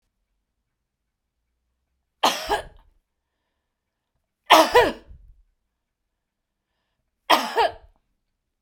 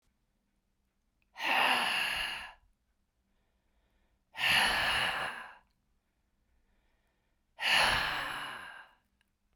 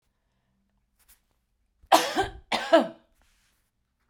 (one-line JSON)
{"three_cough_length": "8.6 s", "three_cough_amplitude": 32767, "three_cough_signal_mean_std_ratio": 0.24, "exhalation_length": "9.6 s", "exhalation_amplitude": 6746, "exhalation_signal_mean_std_ratio": 0.46, "cough_length": "4.1 s", "cough_amplitude": 22340, "cough_signal_mean_std_ratio": 0.27, "survey_phase": "beta (2021-08-13 to 2022-03-07)", "age": "65+", "gender": "Female", "wearing_mask": "No", "symptom_none": true, "smoker_status": "Never smoked", "respiratory_condition_asthma": false, "respiratory_condition_other": false, "recruitment_source": "REACT", "submission_delay": "10 days", "covid_test_result": "Negative", "covid_test_method": "RT-qPCR"}